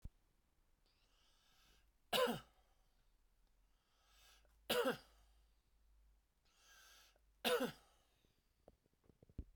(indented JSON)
{
  "three_cough_length": "9.6 s",
  "three_cough_amplitude": 2083,
  "three_cough_signal_mean_std_ratio": 0.27,
  "survey_phase": "beta (2021-08-13 to 2022-03-07)",
  "age": "45-64",
  "gender": "Male",
  "wearing_mask": "No",
  "symptom_fatigue": true,
  "symptom_onset": "12 days",
  "smoker_status": "Never smoked",
  "respiratory_condition_asthma": false,
  "respiratory_condition_other": false,
  "recruitment_source": "REACT",
  "submission_delay": "1 day",
  "covid_test_result": "Negative",
  "covid_test_method": "RT-qPCR"
}